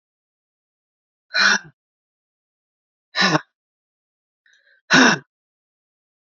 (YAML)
exhalation_length: 6.4 s
exhalation_amplitude: 28608
exhalation_signal_mean_std_ratio: 0.26
survey_phase: beta (2021-08-13 to 2022-03-07)
age: 45-64
gender: Female
wearing_mask: 'No'
symptom_cough_any: true
symptom_runny_or_blocked_nose: true
symptom_shortness_of_breath: true
symptom_sore_throat: true
symptom_fatigue: true
symptom_fever_high_temperature: true
symptom_headache: true
symptom_change_to_sense_of_smell_or_taste: true
symptom_loss_of_taste: true
symptom_onset: 2 days
smoker_status: Never smoked
respiratory_condition_asthma: false
respiratory_condition_other: false
recruitment_source: Test and Trace
submission_delay: 1 day
covid_test_result: Positive
covid_test_method: ePCR